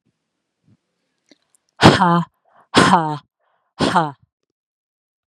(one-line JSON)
{"exhalation_length": "5.3 s", "exhalation_amplitude": 32768, "exhalation_signal_mean_std_ratio": 0.33, "survey_phase": "beta (2021-08-13 to 2022-03-07)", "age": "45-64", "gender": "Female", "wearing_mask": "No", "symptom_none": true, "smoker_status": "Never smoked", "respiratory_condition_asthma": false, "respiratory_condition_other": false, "recruitment_source": "REACT", "submission_delay": "3 days", "covid_test_result": "Negative", "covid_test_method": "RT-qPCR", "influenza_a_test_result": "Unknown/Void", "influenza_b_test_result": "Unknown/Void"}